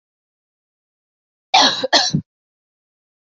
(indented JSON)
{
  "cough_length": "3.3 s",
  "cough_amplitude": 28991,
  "cough_signal_mean_std_ratio": 0.31,
  "survey_phase": "beta (2021-08-13 to 2022-03-07)",
  "age": "18-44",
  "gender": "Female",
  "wearing_mask": "No",
  "symptom_new_continuous_cough": true,
  "symptom_runny_or_blocked_nose": true,
  "symptom_sore_throat": true,
  "symptom_fatigue": true,
  "symptom_fever_high_temperature": true,
  "symptom_headache": true,
  "symptom_change_to_sense_of_smell_or_taste": true,
  "symptom_onset": "3 days",
  "smoker_status": "Never smoked",
  "respiratory_condition_asthma": false,
  "respiratory_condition_other": false,
  "recruitment_source": "Test and Trace",
  "submission_delay": "1 day",
  "covid_test_result": "Positive",
  "covid_test_method": "RT-qPCR",
  "covid_ct_value": 11.8,
  "covid_ct_gene": "ORF1ab gene",
  "covid_ct_mean": 12.3,
  "covid_viral_load": "95000000 copies/ml",
  "covid_viral_load_category": "High viral load (>1M copies/ml)"
}